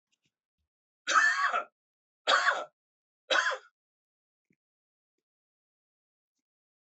{"cough_length": "7.0 s", "cough_amplitude": 8461, "cough_signal_mean_std_ratio": 0.32, "survey_phase": "alpha (2021-03-01 to 2021-08-12)", "age": "45-64", "gender": "Male", "wearing_mask": "No", "symptom_none": true, "smoker_status": "Ex-smoker", "respiratory_condition_asthma": false, "respiratory_condition_other": false, "recruitment_source": "REACT", "submission_delay": "2 days", "covid_test_result": "Negative", "covid_test_method": "RT-qPCR"}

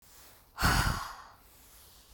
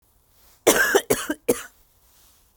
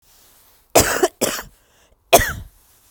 {"exhalation_length": "2.1 s", "exhalation_amplitude": 7472, "exhalation_signal_mean_std_ratio": 0.43, "cough_length": "2.6 s", "cough_amplitude": 31775, "cough_signal_mean_std_ratio": 0.37, "three_cough_length": "2.9 s", "three_cough_amplitude": 32768, "three_cough_signal_mean_std_ratio": 0.34, "survey_phase": "beta (2021-08-13 to 2022-03-07)", "age": "45-64", "gender": "Female", "wearing_mask": "No", "symptom_none": true, "smoker_status": "Current smoker (11 or more cigarettes per day)", "respiratory_condition_asthma": false, "respiratory_condition_other": false, "recruitment_source": "REACT", "submission_delay": "1 day", "covid_test_result": "Negative", "covid_test_method": "RT-qPCR", "influenza_a_test_result": "Negative", "influenza_b_test_result": "Negative"}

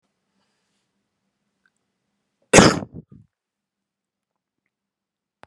{"cough_length": "5.5 s", "cough_amplitude": 32768, "cough_signal_mean_std_ratio": 0.16, "survey_phase": "beta (2021-08-13 to 2022-03-07)", "age": "45-64", "gender": "Male", "wearing_mask": "No", "symptom_headache": true, "symptom_onset": "5 days", "smoker_status": "Ex-smoker", "respiratory_condition_asthma": false, "respiratory_condition_other": false, "recruitment_source": "Test and Trace", "submission_delay": "1 day", "covid_test_result": "Positive", "covid_test_method": "RT-qPCR"}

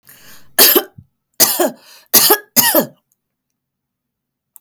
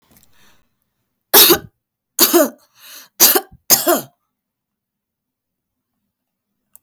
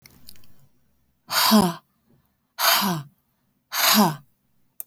{"cough_length": "4.6 s", "cough_amplitude": 32768, "cough_signal_mean_std_ratio": 0.38, "three_cough_length": "6.8 s", "three_cough_amplitude": 32768, "three_cough_signal_mean_std_ratio": 0.3, "exhalation_length": "4.9 s", "exhalation_amplitude": 19998, "exhalation_signal_mean_std_ratio": 0.43, "survey_phase": "alpha (2021-03-01 to 2021-08-12)", "age": "18-44", "gender": "Female", "wearing_mask": "Yes", "symptom_none": true, "smoker_status": "Never smoked", "respiratory_condition_asthma": false, "respiratory_condition_other": false, "recruitment_source": "REACT", "submission_delay": "1 day", "covid_test_result": "Negative", "covid_test_method": "RT-qPCR"}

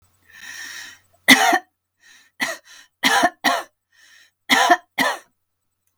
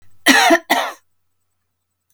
{"three_cough_length": "6.0 s", "three_cough_amplitude": 32768, "three_cough_signal_mean_std_ratio": 0.37, "cough_length": "2.1 s", "cough_amplitude": 32768, "cough_signal_mean_std_ratio": 0.4, "survey_phase": "beta (2021-08-13 to 2022-03-07)", "age": "65+", "gender": "Female", "wearing_mask": "No", "symptom_none": true, "smoker_status": "Never smoked", "respiratory_condition_asthma": false, "respiratory_condition_other": false, "recruitment_source": "REACT", "submission_delay": "3 days", "covid_test_result": "Negative", "covid_test_method": "RT-qPCR", "influenza_a_test_result": "Negative", "influenza_b_test_result": "Negative"}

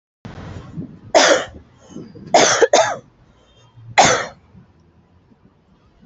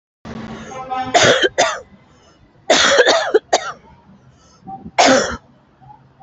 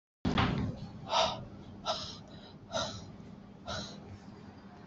{"three_cough_length": "6.1 s", "three_cough_amplitude": 30677, "three_cough_signal_mean_std_ratio": 0.38, "cough_length": "6.2 s", "cough_amplitude": 31888, "cough_signal_mean_std_ratio": 0.48, "exhalation_length": "4.9 s", "exhalation_amplitude": 5748, "exhalation_signal_mean_std_ratio": 0.59, "survey_phase": "beta (2021-08-13 to 2022-03-07)", "age": "45-64", "gender": "Female", "wearing_mask": "No", "symptom_none": true, "smoker_status": "Never smoked", "respiratory_condition_asthma": false, "respiratory_condition_other": false, "recruitment_source": "Test and Trace", "submission_delay": "0 days", "covid_test_result": "Negative", "covid_test_method": "LFT"}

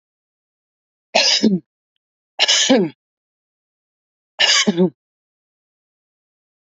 {"three_cough_length": "6.7 s", "three_cough_amplitude": 30066, "three_cough_signal_mean_std_ratio": 0.36, "survey_phase": "beta (2021-08-13 to 2022-03-07)", "age": "18-44", "gender": "Female", "wearing_mask": "No", "symptom_none": true, "smoker_status": "Ex-smoker", "respiratory_condition_asthma": false, "respiratory_condition_other": false, "recruitment_source": "REACT", "submission_delay": "0 days", "covid_test_result": "Negative", "covid_test_method": "RT-qPCR", "influenza_a_test_result": "Negative", "influenza_b_test_result": "Negative"}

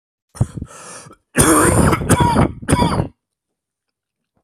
{"cough_length": "4.4 s", "cough_amplitude": 32768, "cough_signal_mean_std_ratio": 0.51, "survey_phase": "beta (2021-08-13 to 2022-03-07)", "age": "18-44", "gender": "Male", "wearing_mask": "No", "symptom_cough_any": true, "symptom_headache": true, "symptom_change_to_sense_of_smell_or_taste": true, "symptom_onset": "5 days", "smoker_status": "Ex-smoker", "respiratory_condition_asthma": false, "respiratory_condition_other": false, "recruitment_source": "Test and Trace", "submission_delay": "2 days", "covid_test_result": "Positive", "covid_test_method": "ePCR"}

